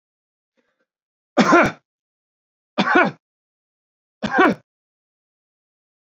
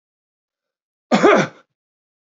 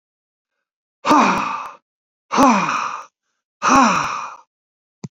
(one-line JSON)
{"three_cough_length": "6.1 s", "three_cough_amplitude": 28065, "three_cough_signal_mean_std_ratio": 0.29, "cough_length": "2.4 s", "cough_amplitude": 27622, "cough_signal_mean_std_ratio": 0.3, "exhalation_length": "5.1 s", "exhalation_amplitude": 27603, "exhalation_signal_mean_std_ratio": 0.47, "survey_phase": "beta (2021-08-13 to 2022-03-07)", "age": "45-64", "gender": "Male", "wearing_mask": "No", "symptom_none": true, "smoker_status": "Ex-smoker", "respiratory_condition_asthma": true, "respiratory_condition_other": false, "recruitment_source": "REACT", "submission_delay": "1 day", "covid_test_result": "Negative", "covid_test_method": "RT-qPCR", "influenza_a_test_result": "Negative", "influenza_b_test_result": "Negative"}